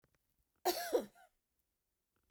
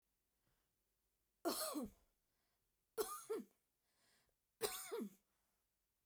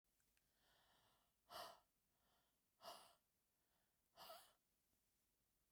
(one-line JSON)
{"cough_length": "2.3 s", "cough_amplitude": 2890, "cough_signal_mean_std_ratio": 0.29, "three_cough_length": "6.1 s", "three_cough_amplitude": 1550, "three_cough_signal_mean_std_ratio": 0.37, "exhalation_length": "5.7 s", "exhalation_amplitude": 205, "exhalation_signal_mean_std_ratio": 0.38, "survey_phase": "beta (2021-08-13 to 2022-03-07)", "age": "45-64", "gender": "Female", "wearing_mask": "No", "symptom_none": true, "smoker_status": "Never smoked", "respiratory_condition_asthma": false, "respiratory_condition_other": false, "recruitment_source": "REACT", "submission_delay": "2 days", "covid_test_result": "Negative", "covid_test_method": "RT-qPCR"}